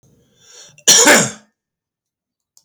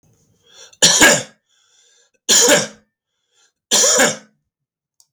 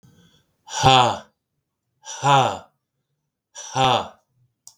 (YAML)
cough_length: 2.6 s
cough_amplitude: 32768
cough_signal_mean_std_ratio: 0.34
three_cough_length: 5.1 s
three_cough_amplitude: 32768
three_cough_signal_mean_std_ratio: 0.41
exhalation_length: 4.8 s
exhalation_amplitude: 32768
exhalation_signal_mean_std_ratio: 0.37
survey_phase: beta (2021-08-13 to 2022-03-07)
age: 45-64
gender: Male
wearing_mask: 'No'
symptom_none: true
smoker_status: Never smoked
respiratory_condition_asthma: false
respiratory_condition_other: false
recruitment_source: REACT
submission_delay: 1 day
covid_test_result: Negative
covid_test_method: RT-qPCR
influenza_a_test_result: Negative
influenza_b_test_result: Negative